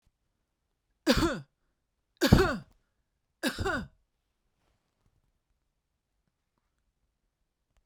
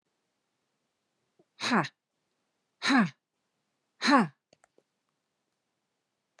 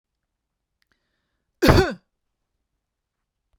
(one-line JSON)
{"three_cough_length": "7.9 s", "three_cough_amplitude": 16845, "three_cough_signal_mean_std_ratio": 0.25, "exhalation_length": "6.4 s", "exhalation_amplitude": 10762, "exhalation_signal_mean_std_ratio": 0.27, "cough_length": "3.6 s", "cough_amplitude": 30556, "cough_signal_mean_std_ratio": 0.22, "survey_phase": "beta (2021-08-13 to 2022-03-07)", "age": "45-64", "gender": "Female", "wearing_mask": "No", "symptom_none": true, "smoker_status": "Ex-smoker", "respiratory_condition_asthma": false, "respiratory_condition_other": false, "recruitment_source": "REACT", "submission_delay": "2 days", "covid_test_result": "Negative", "covid_test_method": "RT-qPCR"}